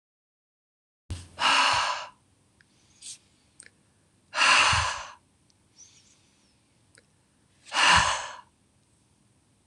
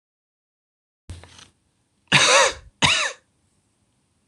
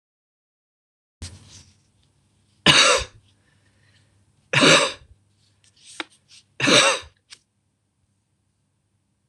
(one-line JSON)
{"exhalation_length": "9.7 s", "exhalation_amplitude": 14351, "exhalation_signal_mean_std_ratio": 0.36, "cough_length": "4.3 s", "cough_amplitude": 25905, "cough_signal_mean_std_ratio": 0.33, "three_cough_length": "9.3 s", "three_cough_amplitude": 26028, "three_cough_signal_mean_std_ratio": 0.28, "survey_phase": "beta (2021-08-13 to 2022-03-07)", "age": "45-64", "gender": "Female", "wearing_mask": "No", "symptom_cough_any": true, "symptom_new_continuous_cough": true, "symptom_runny_or_blocked_nose": true, "symptom_sore_throat": true, "smoker_status": "Never smoked", "respiratory_condition_asthma": false, "respiratory_condition_other": false, "recruitment_source": "Test and Trace", "submission_delay": "2 days", "covid_test_result": "Negative", "covid_test_method": "RT-qPCR"}